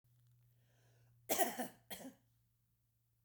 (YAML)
cough_length: 3.2 s
cough_amplitude: 3569
cough_signal_mean_std_ratio: 0.29
survey_phase: beta (2021-08-13 to 2022-03-07)
age: 65+
gender: Female
wearing_mask: 'No'
symptom_cough_any: true
smoker_status: Ex-smoker
respiratory_condition_asthma: false
respiratory_condition_other: false
recruitment_source: REACT
submission_delay: 0 days
covid_test_result: Negative
covid_test_method: RT-qPCR
influenza_a_test_result: Unknown/Void
influenza_b_test_result: Unknown/Void